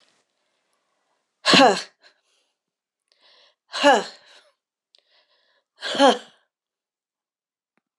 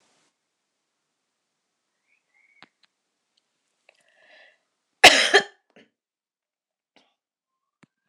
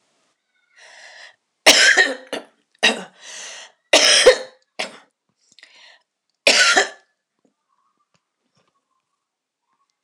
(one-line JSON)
{"exhalation_length": "8.0 s", "exhalation_amplitude": 24283, "exhalation_signal_mean_std_ratio": 0.25, "cough_length": "8.1 s", "cough_amplitude": 26028, "cough_signal_mean_std_ratio": 0.14, "three_cough_length": "10.0 s", "three_cough_amplitude": 26028, "three_cough_signal_mean_std_ratio": 0.31, "survey_phase": "beta (2021-08-13 to 2022-03-07)", "age": "65+", "gender": "Female", "wearing_mask": "No", "symptom_cough_any": true, "symptom_sore_throat": true, "symptom_fatigue": true, "symptom_headache": true, "symptom_other": true, "smoker_status": "Never smoked", "respiratory_condition_asthma": false, "respiratory_condition_other": false, "recruitment_source": "Test and Trace", "submission_delay": "6 days", "covid_test_method": "RT-qPCR"}